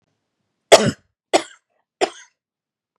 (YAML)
three_cough_length: 3.0 s
three_cough_amplitude: 32768
three_cough_signal_mean_std_ratio: 0.22
survey_phase: beta (2021-08-13 to 2022-03-07)
age: 18-44
gender: Female
wearing_mask: 'No'
symptom_none: true
smoker_status: Never smoked
respiratory_condition_asthma: false
respiratory_condition_other: false
recruitment_source: REACT
submission_delay: 4 days
covid_test_result: Negative
covid_test_method: RT-qPCR
influenza_a_test_result: Negative
influenza_b_test_result: Negative